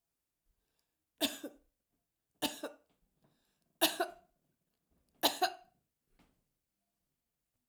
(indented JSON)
{
  "cough_length": "7.7 s",
  "cough_amplitude": 7173,
  "cough_signal_mean_std_ratio": 0.23,
  "survey_phase": "alpha (2021-03-01 to 2021-08-12)",
  "age": "65+",
  "gender": "Female",
  "wearing_mask": "No",
  "symptom_abdominal_pain": true,
  "symptom_change_to_sense_of_smell_or_taste": true,
  "symptom_onset": "13 days",
  "smoker_status": "Never smoked",
  "respiratory_condition_asthma": false,
  "respiratory_condition_other": false,
  "recruitment_source": "REACT",
  "submission_delay": "1 day",
  "covid_test_result": "Negative",
  "covid_test_method": "RT-qPCR"
}